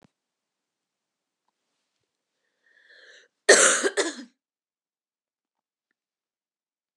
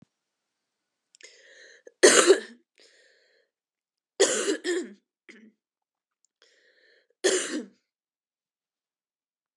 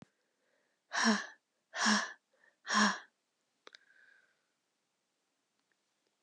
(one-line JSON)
{"cough_length": "7.0 s", "cough_amplitude": 29133, "cough_signal_mean_std_ratio": 0.2, "three_cough_length": "9.6 s", "three_cough_amplitude": 25333, "three_cough_signal_mean_std_ratio": 0.25, "exhalation_length": "6.2 s", "exhalation_amplitude": 5203, "exhalation_signal_mean_std_ratio": 0.31, "survey_phase": "beta (2021-08-13 to 2022-03-07)", "age": "18-44", "gender": "Female", "wearing_mask": "No", "symptom_cough_any": true, "symptom_runny_or_blocked_nose": true, "symptom_fatigue": true, "symptom_onset": "3 days", "smoker_status": "Never smoked", "respiratory_condition_asthma": false, "respiratory_condition_other": false, "recruitment_source": "Test and Trace", "submission_delay": "1 day", "covid_test_result": "Positive", "covid_test_method": "RT-qPCR", "covid_ct_value": 21.8, "covid_ct_gene": "ORF1ab gene"}